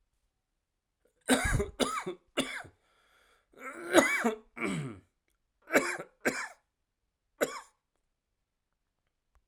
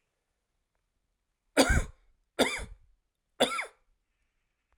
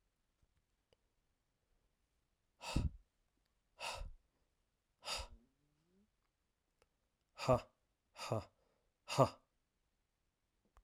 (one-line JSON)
{"cough_length": "9.5 s", "cough_amplitude": 17364, "cough_signal_mean_std_ratio": 0.36, "three_cough_length": "4.8 s", "three_cough_amplitude": 13305, "three_cough_signal_mean_std_ratio": 0.28, "exhalation_length": "10.8 s", "exhalation_amplitude": 5117, "exhalation_signal_mean_std_ratio": 0.23, "survey_phase": "alpha (2021-03-01 to 2021-08-12)", "age": "45-64", "gender": "Male", "wearing_mask": "No", "symptom_cough_any": true, "symptom_shortness_of_breath": true, "symptom_fatigue": true, "symptom_change_to_sense_of_smell_or_taste": true, "symptom_onset": "3 days", "smoker_status": "Ex-smoker", "respiratory_condition_asthma": false, "respiratory_condition_other": false, "recruitment_source": "Test and Trace", "submission_delay": "2 days", "covid_test_result": "Positive", "covid_test_method": "RT-qPCR", "covid_ct_value": 18.4, "covid_ct_gene": "ORF1ab gene"}